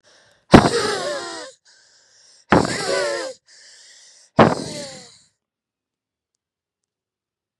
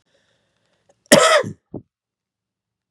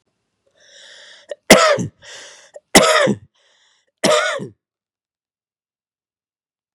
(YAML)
exhalation_length: 7.6 s
exhalation_amplitude: 32768
exhalation_signal_mean_std_ratio: 0.31
cough_length: 2.9 s
cough_amplitude: 32768
cough_signal_mean_std_ratio: 0.27
three_cough_length: 6.7 s
three_cough_amplitude: 32768
three_cough_signal_mean_std_ratio: 0.31
survey_phase: beta (2021-08-13 to 2022-03-07)
age: 65+
gender: Male
wearing_mask: 'No'
symptom_none: true
smoker_status: Never smoked
respiratory_condition_asthma: false
respiratory_condition_other: false
recruitment_source: REACT
submission_delay: 3 days
covid_test_result: Negative
covid_test_method: RT-qPCR
influenza_a_test_result: Negative
influenza_b_test_result: Negative